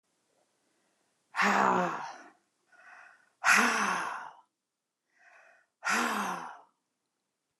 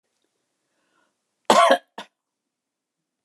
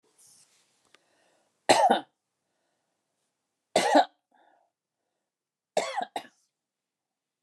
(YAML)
exhalation_length: 7.6 s
exhalation_amplitude: 11358
exhalation_signal_mean_std_ratio: 0.42
cough_length: 3.2 s
cough_amplitude: 27920
cough_signal_mean_std_ratio: 0.23
three_cough_length: 7.4 s
three_cough_amplitude: 19204
three_cough_signal_mean_std_ratio: 0.25
survey_phase: beta (2021-08-13 to 2022-03-07)
age: 65+
gender: Female
wearing_mask: 'No'
symptom_none: true
smoker_status: Never smoked
respiratory_condition_asthma: false
respiratory_condition_other: false
recruitment_source: REACT
submission_delay: 3 days
covid_test_result: Negative
covid_test_method: RT-qPCR